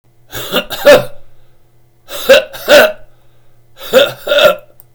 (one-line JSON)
{"three_cough_length": "4.9 s", "three_cough_amplitude": 32768, "three_cough_signal_mean_std_ratio": 0.47, "survey_phase": "beta (2021-08-13 to 2022-03-07)", "age": "65+", "gender": "Male", "wearing_mask": "No", "symptom_none": true, "smoker_status": "Ex-smoker", "respiratory_condition_asthma": false, "respiratory_condition_other": false, "recruitment_source": "REACT", "submission_delay": "2 days", "covid_test_result": "Negative", "covid_test_method": "RT-qPCR", "influenza_a_test_result": "Negative", "influenza_b_test_result": "Negative"}